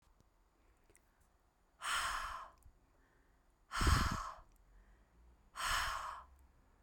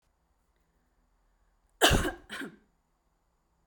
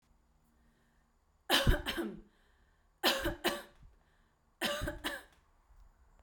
{"exhalation_length": "6.8 s", "exhalation_amplitude": 3595, "exhalation_signal_mean_std_ratio": 0.41, "cough_length": "3.7 s", "cough_amplitude": 13772, "cough_signal_mean_std_ratio": 0.24, "three_cough_length": "6.2 s", "three_cough_amplitude": 7169, "three_cough_signal_mean_std_ratio": 0.38, "survey_phase": "beta (2021-08-13 to 2022-03-07)", "age": "18-44", "gender": "Female", "wearing_mask": "No", "symptom_none": true, "smoker_status": "Never smoked", "respiratory_condition_asthma": false, "respiratory_condition_other": false, "recruitment_source": "REACT", "submission_delay": "1 day", "covid_test_result": "Negative", "covid_test_method": "RT-qPCR"}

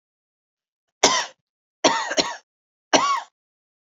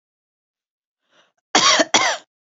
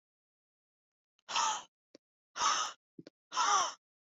{"three_cough_length": "3.8 s", "three_cough_amplitude": 30421, "three_cough_signal_mean_std_ratio": 0.36, "cough_length": "2.6 s", "cough_amplitude": 27893, "cough_signal_mean_std_ratio": 0.35, "exhalation_length": "4.1 s", "exhalation_amplitude": 4821, "exhalation_signal_mean_std_ratio": 0.4, "survey_phase": "beta (2021-08-13 to 2022-03-07)", "age": "18-44", "gender": "Female", "wearing_mask": "No", "symptom_cough_any": true, "symptom_runny_or_blocked_nose": true, "symptom_sore_throat": true, "symptom_onset": "8 days", "smoker_status": "Never smoked", "respiratory_condition_asthma": true, "respiratory_condition_other": false, "recruitment_source": "REACT", "submission_delay": "1 day", "covid_test_result": "Negative", "covid_test_method": "RT-qPCR"}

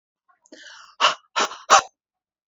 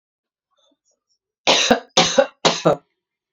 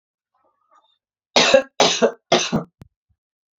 {"exhalation_length": "2.5 s", "exhalation_amplitude": 30854, "exhalation_signal_mean_std_ratio": 0.3, "cough_length": "3.3 s", "cough_amplitude": 32767, "cough_signal_mean_std_ratio": 0.37, "three_cough_length": "3.6 s", "three_cough_amplitude": 32625, "three_cough_signal_mean_std_ratio": 0.36, "survey_phase": "beta (2021-08-13 to 2022-03-07)", "age": "18-44", "gender": "Female", "wearing_mask": "No", "symptom_none": true, "smoker_status": "Ex-smoker", "respiratory_condition_asthma": false, "respiratory_condition_other": false, "recruitment_source": "REACT", "submission_delay": "2 days", "covid_test_result": "Negative", "covid_test_method": "RT-qPCR"}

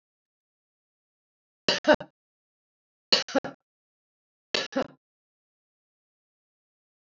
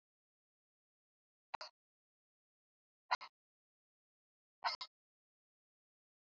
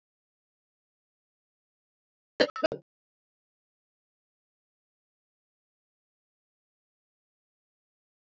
{"three_cough_length": "7.1 s", "three_cough_amplitude": 25056, "three_cough_signal_mean_std_ratio": 0.19, "exhalation_length": "6.4 s", "exhalation_amplitude": 2633, "exhalation_signal_mean_std_ratio": 0.14, "cough_length": "8.4 s", "cough_amplitude": 11882, "cough_signal_mean_std_ratio": 0.1, "survey_phase": "alpha (2021-03-01 to 2021-08-12)", "age": "65+", "gender": "Female", "wearing_mask": "No", "symptom_none": true, "smoker_status": "Ex-smoker", "respiratory_condition_asthma": false, "respiratory_condition_other": false, "recruitment_source": "REACT", "submission_delay": "3 days", "covid_test_result": "Negative", "covid_test_method": "RT-qPCR"}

